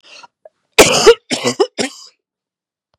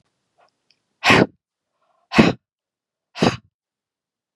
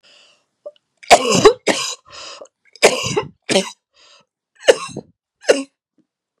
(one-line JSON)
{"cough_length": "3.0 s", "cough_amplitude": 32768, "cough_signal_mean_std_ratio": 0.35, "exhalation_length": "4.4 s", "exhalation_amplitude": 32767, "exhalation_signal_mean_std_ratio": 0.26, "three_cough_length": "6.4 s", "three_cough_amplitude": 32768, "three_cough_signal_mean_std_ratio": 0.33, "survey_phase": "beta (2021-08-13 to 2022-03-07)", "age": "45-64", "gender": "Female", "wearing_mask": "No", "symptom_cough_any": true, "symptom_sore_throat": true, "symptom_headache": true, "symptom_onset": "6 days", "smoker_status": "Never smoked", "respiratory_condition_asthma": false, "respiratory_condition_other": false, "recruitment_source": "Test and Trace", "submission_delay": "3 days", "covid_test_result": "Negative", "covid_test_method": "ePCR"}